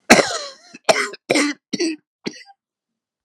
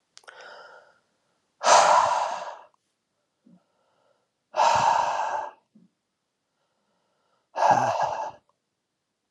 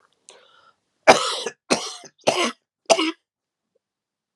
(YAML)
cough_length: 3.2 s
cough_amplitude: 32768
cough_signal_mean_std_ratio: 0.38
exhalation_length: 9.3 s
exhalation_amplitude: 25317
exhalation_signal_mean_std_ratio: 0.4
three_cough_length: 4.4 s
three_cough_amplitude: 32768
three_cough_signal_mean_std_ratio: 0.31
survey_phase: alpha (2021-03-01 to 2021-08-12)
age: 45-64
gender: Male
wearing_mask: 'No'
symptom_shortness_of_breath: true
symptom_fatigue: true
symptom_headache: true
symptom_change_to_sense_of_smell_or_taste: true
symptom_onset: 3 days
smoker_status: Never smoked
respiratory_condition_asthma: false
respiratory_condition_other: false
recruitment_source: Test and Trace
submission_delay: 2 days
covid_test_result: Positive
covid_test_method: RT-qPCR